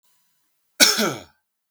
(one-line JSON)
{"cough_length": "1.7 s", "cough_amplitude": 32768, "cough_signal_mean_std_ratio": 0.32, "survey_phase": "beta (2021-08-13 to 2022-03-07)", "age": "45-64", "gender": "Male", "wearing_mask": "No", "symptom_none": true, "smoker_status": "Never smoked", "respiratory_condition_asthma": false, "respiratory_condition_other": false, "recruitment_source": "REACT", "submission_delay": "1 day", "covid_test_result": "Negative", "covid_test_method": "RT-qPCR"}